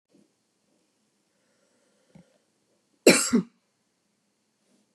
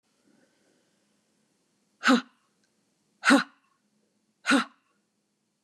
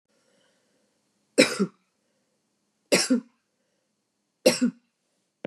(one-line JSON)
{"cough_length": "4.9 s", "cough_amplitude": 26512, "cough_signal_mean_std_ratio": 0.18, "exhalation_length": "5.6 s", "exhalation_amplitude": 14944, "exhalation_signal_mean_std_ratio": 0.24, "three_cough_length": "5.5 s", "three_cough_amplitude": 23102, "three_cough_signal_mean_std_ratio": 0.26, "survey_phase": "beta (2021-08-13 to 2022-03-07)", "age": "45-64", "gender": "Female", "wearing_mask": "No", "symptom_none": true, "smoker_status": "Never smoked", "respiratory_condition_asthma": false, "respiratory_condition_other": false, "recruitment_source": "REACT", "submission_delay": "0 days", "covid_test_result": "Negative", "covid_test_method": "RT-qPCR", "influenza_a_test_result": "Negative", "influenza_b_test_result": "Negative"}